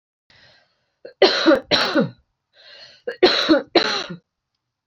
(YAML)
cough_length: 4.9 s
cough_amplitude: 28665
cough_signal_mean_std_ratio: 0.43
survey_phase: beta (2021-08-13 to 2022-03-07)
age: 18-44
gender: Female
wearing_mask: 'No'
symptom_runny_or_blocked_nose: true
symptom_change_to_sense_of_smell_or_taste: true
smoker_status: Never smoked
recruitment_source: Test and Trace
submission_delay: 2 days
covid_test_result: Positive
covid_test_method: RT-qPCR
covid_ct_value: 15.4
covid_ct_gene: ORF1ab gene
covid_ct_mean: 15.6
covid_viral_load: 7400000 copies/ml
covid_viral_load_category: High viral load (>1M copies/ml)